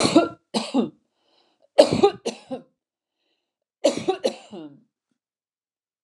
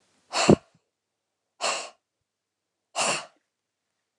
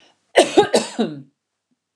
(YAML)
three_cough_length: 6.0 s
three_cough_amplitude: 29204
three_cough_signal_mean_std_ratio: 0.32
exhalation_length: 4.2 s
exhalation_amplitude: 27836
exhalation_signal_mean_std_ratio: 0.26
cough_length: 2.0 s
cough_amplitude: 29204
cough_signal_mean_std_ratio: 0.37
survey_phase: alpha (2021-03-01 to 2021-08-12)
age: 65+
gender: Female
wearing_mask: 'No'
symptom_none: true
smoker_status: Never smoked
respiratory_condition_asthma: false
respiratory_condition_other: false
recruitment_source: REACT
submission_delay: 1 day
covid_test_result: Negative
covid_test_method: RT-qPCR